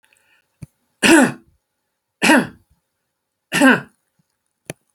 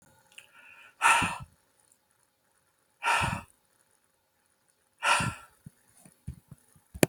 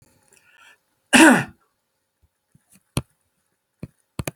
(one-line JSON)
{"three_cough_length": "4.9 s", "three_cough_amplitude": 31713, "three_cough_signal_mean_std_ratio": 0.32, "exhalation_length": "7.1 s", "exhalation_amplitude": 23854, "exhalation_signal_mean_std_ratio": 0.3, "cough_length": "4.4 s", "cough_amplitude": 32181, "cough_signal_mean_std_ratio": 0.23, "survey_phase": "beta (2021-08-13 to 2022-03-07)", "age": "65+", "gender": "Male", "wearing_mask": "No", "symptom_none": true, "smoker_status": "Ex-smoker", "respiratory_condition_asthma": false, "respiratory_condition_other": false, "recruitment_source": "REACT", "submission_delay": "1 day", "covid_test_result": "Negative", "covid_test_method": "RT-qPCR"}